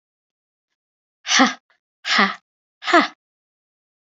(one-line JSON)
{"exhalation_length": "4.0 s", "exhalation_amplitude": 27906, "exhalation_signal_mean_std_ratio": 0.32, "survey_phase": "beta (2021-08-13 to 2022-03-07)", "age": "18-44", "gender": "Female", "wearing_mask": "No", "symptom_cough_any": true, "symptom_sore_throat": true, "symptom_fatigue": true, "symptom_fever_high_temperature": true, "symptom_other": true, "symptom_onset": "3 days", "smoker_status": "Never smoked", "respiratory_condition_asthma": false, "respiratory_condition_other": false, "recruitment_source": "Test and Trace", "submission_delay": "2 days", "covid_test_result": "Positive", "covid_test_method": "RT-qPCR", "covid_ct_value": 17.5, "covid_ct_gene": "ORF1ab gene", "covid_ct_mean": 17.9, "covid_viral_load": "1400000 copies/ml", "covid_viral_load_category": "High viral load (>1M copies/ml)"}